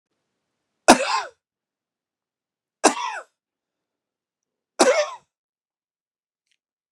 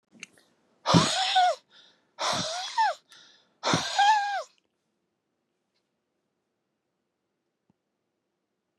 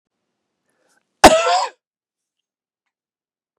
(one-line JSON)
{"three_cough_length": "6.9 s", "three_cough_amplitude": 32768, "three_cough_signal_mean_std_ratio": 0.23, "exhalation_length": "8.8 s", "exhalation_amplitude": 19740, "exhalation_signal_mean_std_ratio": 0.38, "cough_length": "3.6 s", "cough_amplitude": 32768, "cough_signal_mean_std_ratio": 0.23, "survey_phase": "beta (2021-08-13 to 2022-03-07)", "age": "45-64", "gender": "Male", "wearing_mask": "No", "symptom_none": true, "smoker_status": "Never smoked", "respiratory_condition_asthma": false, "respiratory_condition_other": false, "recruitment_source": "REACT", "submission_delay": "1 day", "covid_test_result": "Negative", "covid_test_method": "RT-qPCR", "influenza_a_test_result": "Negative", "influenza_b_test_result": "Negative"}